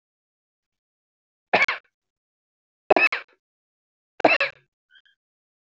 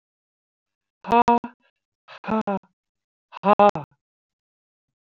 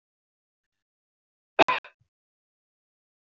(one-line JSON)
{"three_cough_length": "5.7 s", "three_cough_amplitude": 26794, "three_cough_signal_mean_std_ratio": 0.23, "exhalation_length": "5.0 s", "exhalation_amplitude": 22460, "exhalation_signal_mean_std_ratio": 0.26, "cough_length": "3.3 s", "cough_amplitude": 23340, "cough_signal_mean_std_ratio": 0.13, "survey_phase": "alpha (2021-03-01 to 2021-08-12)", "age": "45-64", "gender": "Female", "wearing_mask": "No", "symptom_none": true, "smoker_status": "Ex-smoker", "respiratory_condition_asthma": false, "respiratory_condition_other": false, "recruitment_source": "REACT", "submission_delay": "2 days", "covid_test_result": "Negative", "covid_test_method": "RT-qPCR"}